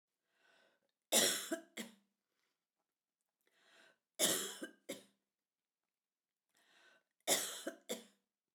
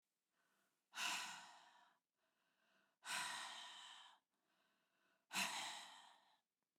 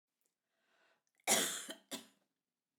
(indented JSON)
{
  "three_cough_length": "8.5 s",
  "three_cough_amplitude": 4834,
  "three_cough_signal_mean_std_ratio": 0.29,
  "exhalation_length": "6.8 s",
  "exhalation_amplitude": 1029,
  "exhalation_signal_mean_std_ratio": 0.44,
  "cough_length": "2.8 s",
  "cough_amplitude": 4745,
  "cough_signal_mean_std_ratio": 0.29,
  "survey_phase": "beta (2021-08-13 to 2022-03-07)",
  "age": "45-64",
  "gender": "Female",
  "wearing_mask": "No",
  "symptom_cough_any": true,
  "symptom_runny_or_blocked_nose": true,
  "symptom_onset": "6 days",
  "smoker_status": "Never smoked",
  "respiratory_condition_asthma": false,
  "respiratory_condition_other": false,
  "recruitment_source": "REACT",
  "submission_delay": "2 days",
  "covid_test_result": "Negative",
  "covid_test_method": "RT-qPCR"
}